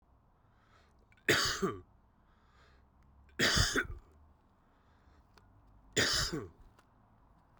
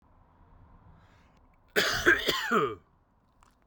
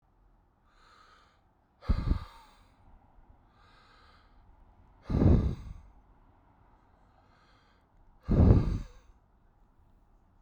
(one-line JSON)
{"three_cough_length": "7.6 s", "three_cough_amplitude": 6306, "three_cough_signal_mean_std_ratio": 0.37, "cough_length": "3.7 s", "cough_amplitude": 12308, "cough_signal_mean_std_ratio": 0.4, "exhalation_length": "10.4 s", "exhalation_amplitude": 12114, "exhalation_signal_mean_std_ratio": 0.29, "survey_phase": "beta (2021-08-13 to 2022-03-07)", "age": "45-64", "gender": "Male", "wearing_mask": "No", "symptom_none": true, "smoker_status": "Current smoker (11 or more cigarettes per day)", "respiratory_condition_asthma": false, "respiratory_condition_other": false, "recruitment_source": "REACT", "submission_delay": "3 days", "covid_test_result": "Negative", "covid_test_method": "RT-qPCR"}